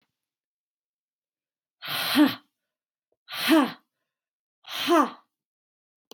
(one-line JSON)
{"exhalation_length": "6.1 s", "exhalation_amplitude": 13806, "exhalation_signal_mean_std_ratio": 0.32, "survey_phase": "beta (2021-08-13 to 2022-03-07)", "age": "18-44", "gender": "Female", "wearing_mask": "No", "symptom_none": true, "smoker_status": "Never smoked", "respiratory_condition_asthma": false, "respiratory_condition_other": false, "recruitment_source": "REACT", "submission_delay": "1 day", "covid_test_result": "Negative", "covid_test_method": "RT-qPCR", "influenza_a_test_result": "Unknown/Void", "influenza_b_test_result": "Unknown/Void"}